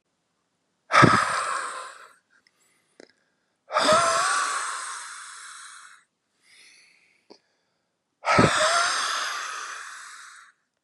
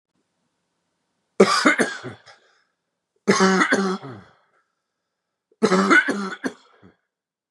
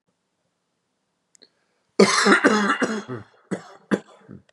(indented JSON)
{
  "exhalation_length": "10.8 s",
  "exhalation_amplitude": 26155,
  "exhalation_signal_mean_std_ratio": 0.44,
  "three_cough_length": "7.5 s",
  "three_cough_amplitude": 31995,
  "three_cough_signal_mean_std_ratio": 0.39,
  "cough_length": "4.5 s",
  "cough_amplitude": 31066,
  "cough_signal_mean_std_ratio": 0.38,
  "survey_phase": "beta (2021-08-13 to 2022-03-07)",
  "age": "45-64",
  "gender": "Male",
  "wearing_mask": "No",
  "symptom_none": true,
  "symptom_onset": "12 days",
  "smoker_status": "Never smoked",
  "respiratory_condition_asthma": false,
  "respiratory_condition_other": false,
  "recruitment_source": "REACT",
  "submission_delay": "2 days",
  "covid_test_result": "Negative",
  "covid_test_method": "RT-qPCR",
  "influenza_a_test_result": "Negative",
  "influenza_b_test_result": "Negative"
}